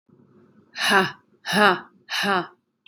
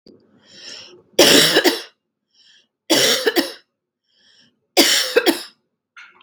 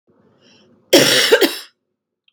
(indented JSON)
{
  "exhalation_length": "2.9 s",
  "exhalation_amplitude": 24474,
  "exhalation_signal_mean_std_ratio": 0.44,
  "three_cough_length": "6.2 s",
  "three_cough_amplitude": 32768,
  "three_cough_signal_mean_std_ratio": 0.41,
  "cough_length": "2.3 s",
  "cough_amplitude": 32768,
  "cough_signal_mean_std_ratio": 0.41,
  "survey_phase": "beta (2021-08-13 to 2022-03-07)",
  "age": "18-44",
  "gender": "Female",
  "wearing_mask": "No",
  "symptom_fatigue": true,
  "symptom_headache": true,
  "symptom_change_to_sense_of_smell_or_taste": true,
  "symptom_loss_of_taste": true,
  "symptom_onset": "8 days",
  "smoker_status": "Never smoked",
  "respiratory_condition_asthma": false,
  "respiratory_condition_other": false,
  "recruitment_source": "Test and Trace",
  "submission_delay": "4 days",
  "covid_test_result": "Positive",
  "covid_test_method": "RT-qPCR"
}